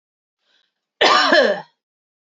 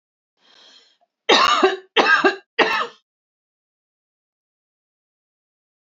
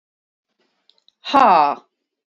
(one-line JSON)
{"cough_length": "2.4 s", "cough_amplitude": 28168, "cough_signal_mean_std_ratio": 0.4, "three_cough_length": "5.8 s", "three_cough_amplitude": 32144, "three_cough_signal_mean_std_ratio": 0.34, "exhalation_length": "2.4 s", "exhalation_amplitude": 27665, "exhalation_signal_mean_std_ratio": 0.33, "survey_phase": "beta (2021-08-13 to 2022-03-07)", "age": "45-64", "gender": "Female", "wearing_mask": "No", "symptom_fatigue": true, "symptom_headache": true, "smoker_status": "Never smoked", "respiratory_condition_asthma": false, "respiratory_condition_other": false, "recruitment_source": "REACT", "submission_delay": "3 days", "covid_test_result": "Negative", "covid_test_method": "RT-qPCR", "influenza_a_test_result": "Unknown/Void", "influenza_b_test_result": "Unknown/Void"}